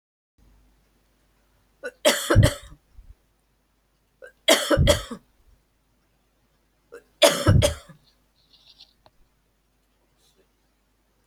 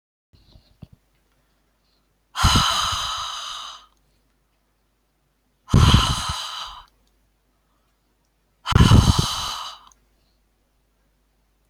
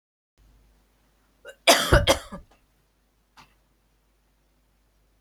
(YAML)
three_cough_length: 11.3 s
three_cough_amplitude: 29063
three_cough_signal_mean_std_ratio: 0.28
exhalation_length: 11.7 s
exhalation_amplitude: 26944
exhalation_signal_mean_std_ratio: 0.34
cough_length: 5.2 s
cough_amplitude: 28996
cough_signal_mean_std_ratio: 0.23
survey_phase: beta (2021-08-13 to 2022-03-07)
age: 65+
gender: Female
wearing_mask: 'No'
symptom_none: true
smoker_status: Ex-smoker
respiratory_condition_asthma: false
respiratory_condition_other: false
recruitment_source: REACT
submission_delay: 2 days
covid_test_result: Negative
covid_test_method: RT-qPCR
influenza_a_test_result: Negative
influenza_b_test_result: Negative